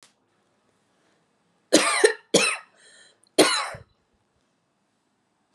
{"three_cough_length": "5.5 s", "three_cough_amplitude": 25403, "three_cough_signal_mean_std_ratio": 0.3, "survey_phase": "alpha (2021-03-01 to 2021-08-12)", "age": "18-44", "gender": "Female", "wearing_mask": "No", "symptom_fatigue": true, "symptom_fever_high_temperature": true, "symptom_headache": true, "symptom_onset": "4 days", "smoker_status": "Never smoked", "respiratory_condition_asthma": false, "respiratory_condition_other": false, "recruitment_source": "Test and Trace", "submission_delay": "1 day", "covid_test_result": "Positive", "covid_test_method": "RT-qPCR", "covid_ct_value": 34.9, "covid_ct_gene": "ORF1ab gene"}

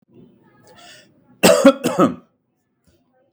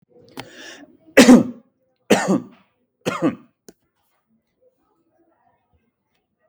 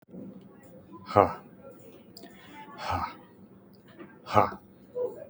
{"cough_length": "3.3 s", "cough_amplitude": 32768, "cough_signal_mean_std_ratio": 0.31, "three_cough_length": "6.5 s", "three_cough_amplitude": 32768, "three_cough_signal_mean_std_ratio": 0.25, "exhalation_length": "5.3 s", "exhalation_amplitude": 23451, "exhalation_signal_mean_std_ratio": 0.33, "survey_phase": "beta (2021-08-13 to 2022-03-07)", "age": "45-64", "gender": "Male", "wearing_mask": "Yes", "symptom_none": true, "smoker_status": "Never smoked", "respiratory_condition_asthma": false, "respiratory_condition_other": false, "recruitment_source": "REACT", "submission_delay": "1 day", "covid_test_result": "Negative", "covid_test_method": "RT-qPCR", "influenza_a_test_result": "Negative", "influenza_b_test_result": "Negative"}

